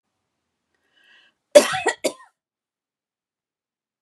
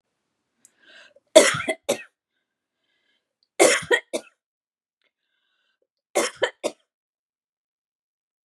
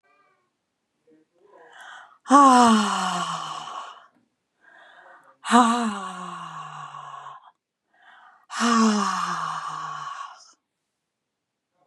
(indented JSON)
{
  "cough_length": "4.0 s",
  "cough_amplitude": 32768,
  "cough_signal_mean_std_ratio": 0.18,
  "three_cough_length": "8.4 s",
  "three_cough_amplitude": 32768,
  "three_cough_signal_mean_std_ratio": 0.23,
  "exhalation_length": "11.9 s",
  "exhalation_amplitude": 27781,
  "exhalation_signal_mean_std_ratio": 0.4,
  "survey_phase": "beta (2021-08-13 to 2022-03-07)",
  "age": "45-64",
  "gender": "Female",
  "wearing_mask": "No",
  "symptom_cough_any": true,
  "symptom_runny_or_blocked_nose": true,
  "symptom_sore_throat": true,
  "symptom_fatigue": true,
  "symptom_onset": "6 days",
  "smoker_status": "Never smoked",
  "respiratory_condition_asthma": false,
  "respiratory_condition_other": false,
  "recruitment_source": "REACT",
  "submission_delay": "1 day",
  "covid_test_result": "Negative",
  "covid_test_method": "RT-qPCR",
  "influenza_a_test_result": "Negative",
  "influenza_b_test_result": "Negative"
}